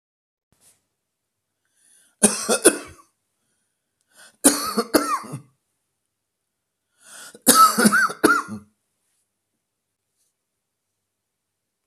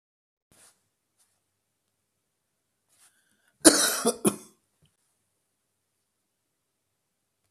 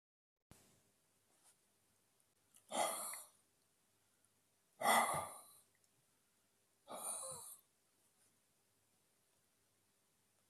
three_cough_length: 11.9 s
three_cough_amplitude: 32768
three_cough_signal_mean_std_ratio: 0.29
cough_length: 7.5 s
cough_amplitude: 32767
cough_signal_mean_std_ratio: 0.17
exhalation_length: 10.5 s
exhalation_amplitude: 3303
exhalation_signal_mean_std_ratio: 0.27
survey_phase: beta (2021-08-13 to 2022-03-07)
age: 65+
gender: Male
wearing_mask: 'No'
symptom_other: true
smoker_status: Never smoked
respiratory_condition_asthma: false
respiratory_condition_other: false
recruitment_source: REACT
submission_delay: 2 days
covid_test_result: Negative
covid_test_method: RT-qPCR
influenza_a_test_result: Negative
influenza_b_test_result: Negative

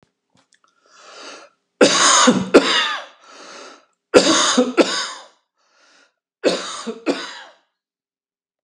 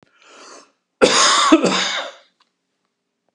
three_cough_length: 8.6 s
three_cough_amplitude: 32768
three_cough_signal_mean_std_ratio: 0.41
cough_length: 3.3 s
cough_amplitude: 32767
cough_signal_mean_std_ratio: 0.44
survey_phase: beta (2021-08-13 to 2022-03-07)
age: 65+
gender: Male
wearing_mask: 'No'
symptom_cough_any: true
symptom_runny_or_blocked_nose: true
symptom_other: true
smoker_status: Ex-smoker
respiratory_condition_asthma: true
respiratory_condition_other: false
recruitment_source: REACT
submission_delay: 1 day
covid_test_result: Negative
covid_test_method: RT-qPCR
influenza_a_test_result: Negative
influenza_b_test_result: Negative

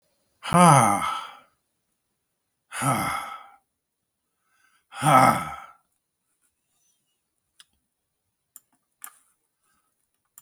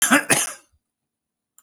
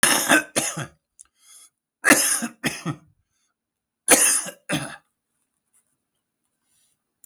exhalation_length: 10.4 s
exhalation_amplitude: 30326
exhalation_signal_mean_std_ratio: 0.29
cough_length: 1.6 s
cough_amplitude: 23113
cough_signal_mean_std_ratio: 0.38
three_cough_length: 7.3 s
three_cough_amplitude: 30961
three_cough_signal_mean_std_ratio: 0.36
survey_phase: beta (2021-08-13 to 2022-03-07)
age: 65+
gender: Male
wearing_mask: 'No'
symptom_cough_any: true
symptom_runny_or_blocked_nose: true
symptom_diarrhoea: true
symptom_onset: 4 days
smoker_status: Never smoked
respiratory_condition_asthma: false
respiratory_condition_other: false
recruitment_source: REACT
submission_delay: 2 days
covid_test_result: Negative
covid_test_method: RT-qPCR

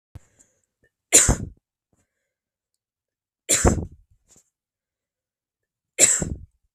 three_cough_length: 6.7 s
three_cough_amplitude: 32768
three_cough_signal_mean_std_ratio: 0.26
survey_phase: beta (2021-08-13 to 2022-03-07)
age: 18-44
gender: Female
wearing_mask: 'No'
symptom_none: true
smoker_status: Never smoked
respiratory_condition_asthma: false
respiratory_condition_other: false
recruitment_source: REACT
submission_delay: 1 day
covid_test_result: Negative
covid_test_method: RT-qPCR
influenza_a_test_result: Negative
influenza_b_test_result: Negative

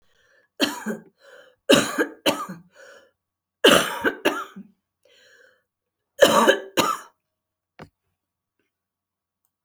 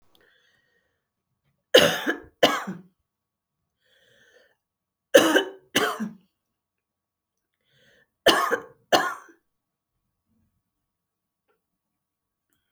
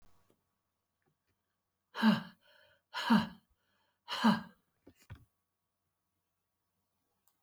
cough_length: 9.6 s
cough_amplitude: 31305
cough_signal_mean_std_ratio: 0.32
three_cough_length: 12.7 s
three_cough_amplitude: 31030
three_cough_signal_mean_std_ratio: 0.25
exhalation_length: 7.4 s
exhalation_amplitude: 5128
exhalation_signal_mean_std_ratio: 0.25
survey_phase: alpha (2021-03-01 to 2021-08-12)
age: 65+
gender: Female
wearing_mask: 'No'
symptom_cough_any: true
symptom_shortness_of_breath: true
symptom_fatigue: true
symptom_headache: true
symptom_onset: 12 days
smoker_status: Never smoked
respiratory_condition_asthma: false
respiratory_condition_other: false
recruitment_source: REACT
submission_delay: 3 days
covid_test_result: Negative
covid_test_method: RT-qPCR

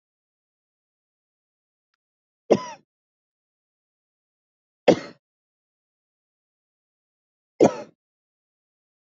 three_cough_length: 9.0 s
three_cough_amplitude: 26646
three_cough_signal_mean_std_ratio: 0.14
survey_phase: beta (2021-08-13 to 2022-03-07)
age: 18-44
gender: Female
wearing_mask: 'No'
symptom_new_continuous_cough: true
symptom_runny_or_blocked_nose: true
symptom_headache: true
symptom_onset: 2 days
smoker_status: Ex-smoker
respiratory_condition_asthma: false
respiratory_condition_other: false
recruitment_source: Test and Trace
submission_delay: 2 days
covid_test_result: Positive
covid_test_method: RT-qPCR
covid_ct_value: 22.6
covid_ct_gene: N gene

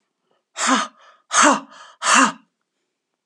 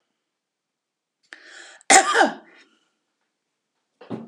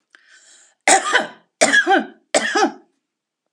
exhalation_length: 3.3 s
exhalation_amplitude: 29986
exhalation_signal_mean_std_ratio: 0.41
cough_length: 4.3 s
cough_amplitude: 32767
cough_signal_mean_std_ratio: 0.25
three_cough_length: 3.5 s
three_cough_amplitude: 32432
three_cough_signal_mean_std_ratio: 0.45
survey_phase: alpha (2021-03-01 to 2021-08-12)
age: 65+
gender: Female
wearing_mask: 'No'
symptom_none: true
smoker_status: Never smoked
respiratory_condition_asthma: false
respiratory_condition_other: false
recruitment_source: REACT
submission_delay: 1 day
covid_test_result: Negative
covid_test_method: RT-qPCR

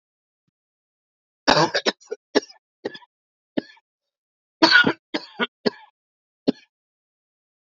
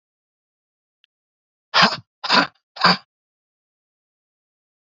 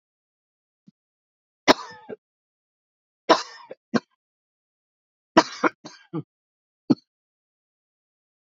cough_length: 7.7 s
cough_amplitude: 28186
cough_signal_mean_std_ratio: 0.25
exhalation_length: 4.9 s
exhalation_amplitude: 32768
exhalation_signal_mean_std_ratio: 0.25
three_cough_length: 8.4 s
three_cough_amplitude: 29734
three_cough_signal_mean_std_ratio: 0.17
survey_phase: alpha (2021-03-01 to 2021-08-12)
age: 45-64
gender: Male
wearing_mask: 'No'
symptom_cough_any: true
symptom_abdominal_pain: true
symptom_fatigue: true
symptom_fever_high_temperature: true
symptom_headache: true
symptom_change_to_sense_of_smell_or_taste: true
smoker_status: Never smoked
respiratory_condition_asthma: false
respiratory_condition_other: false
recruitment_source: Test and Trace
submission_delay: 2 days
covid_test_result: Positive
covid_test_method: RT-qPCR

